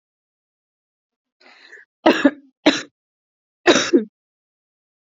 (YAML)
three_cough_length: 5.1 s
three_cough_amplitude: 28235
three_cough_signal_mean_std_ratio: 0.27
survey_phase: beta (2021-08-13 to 2022-03-07)
age: 18-44
gender: Female
wearing_mask: 'No'
symptom_fatigue: true
symptom_headache: true
symptom_onset: 4 days
smoker_status: Current smoker (1 to 10 cigarettes per day)
respiratory_condition_asthma: false
respiratory_condition_other: false
recruitment_source: REACT
submission_delay: 0 days
covid_test_result: Negative
covid_test_method: RT-qPCR
influenza_a_test_result: Negative
influenza_b_test_result: Negative